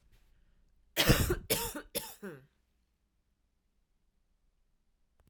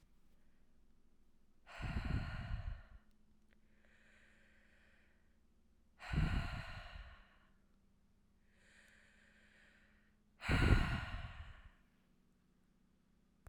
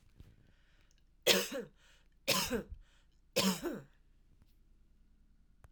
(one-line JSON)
{"cough_length": "5.3 s", "cough_amplitude": 9557, "cough_signal_mean_std_ratio": 0.29, "exhalation_length": "13.5 s", "exhalation_amplitude": 4392, "exhalation_signal_mean_std_ratio": 0.35, "three_cough_length": "5.7 s", "three_cough_amplitude": 7548, "three_cough_signal_mean_std_ratio": 0.35, "survey_phase": "alpha (2021-03-01 to 2021-08-12)", "age": "45-64", "gender": "Female", "wearing_mask": "No", "symptom_none": true, "smoker_status": "Ex-smoker", "respiratory_condition_asthma": false, "respiratory_condition_other": false, "recruitment_source": "REACT", "submission_delay": "2 days", "covid_test_result": "Negative", "covid_test_method": "RT-qPCR"}